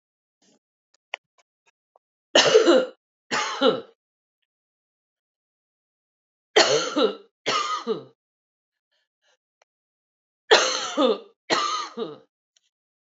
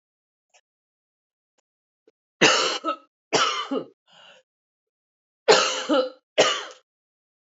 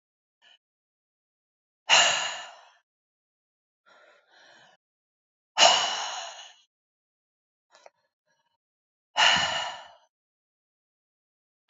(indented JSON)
{
  "three_cough_length": "13.1 s",
  "three_cough_amplitude": 27052,
  "three_cough_signal_mean_std_ratio": 0.35,
  "cough_length": "7.4 s",
  "cough_amplitude": 24956,
  "cough_signal_mean_std_ratio": 0.36,
  "exhalation_length": "11.7 s",
  "exhalation_amplitude": 20270,
  "exhalation_signal_mean_std_ratio": 0.27,
  "survey_phase": "alpha (2021-03-01 to 2021-08-12)",
  "age": "45-64",
  "gender": "Female",
  "wearing_mask": "No",
  "symptom_cough_any": true,
  "smoker_status": "Ex-smoker",
  "respiratory_condition_asthma": false,
  "respiratory_condition_other": false,
  "recruitment_source": "Test and Trace",
  "submission_delay": "2 days",
  "covid_test_result": "Positive",
  "covid_test_method": "RT-qPCR",
  "covid_ct_value": 20.3,
  "covid_ct_gene": "S gene",
  "covid_ct_mean": 20.7,
  "covid_viral_load": "160000 copies/ml",
  "covid_viral_load_category": "Low viral load (10K-1M copies/ml)"
}